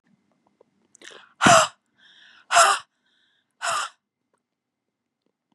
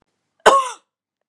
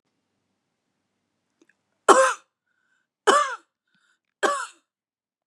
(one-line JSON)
{"exhalation_length": "5.5 s", "exhalation_amplitude": 26400, "exhalation_signal_mean_std_ratio": 0.27, "cough_length": "1.3 s", "cough_amplitude": 32768, "cough_signal_mean_std_ratio": 0.31, "three_cough_length": "5.5 s", "three_cough_amplitude": 32263, "three_cough_signal_mean_std_ratio": 0.26, "survey_phase": "beta (2021-08-13 to 2022-03-07)", "age": "45-64", "gender": "Female", "wearing_mask": "No", "symptom_none": true, "smoker_status": "Never smoked", "respiratory_condition_asthma": false, "respiratory_condition_other": false, "recruitment_source": "REACT", "submission_delay": "1 day", "covid_test_result": "Negative", "covid_test_method": "RT-qPCR", "influenza_a_test_result": "Negative", "influenza_b_test_result": "Negative"}